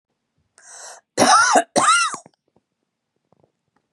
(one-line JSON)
{"three_cough_length": "3.9 s", "three_cough_amplitude": 29756, "three_cough_signal_mean_std_ratio": 0.39, "survey_phase": "beta (2021-08-13 to 2022-03-07)", "age": "45-64", "gender": "Female", "wearing_mask": "No", "symptom_none": true, "smoker_status": "Never smoked", "respiratory_condition_asthma": false, "respiratory_condition_other": false, "recruitment_source": "REACT", "submission_delay": "2 days", "covid_test_result": "Negative", "covid_test_method": "RT-qPCR", "influenza_a_test_result": "Negative", "influenza_b_test_result": "Negative"}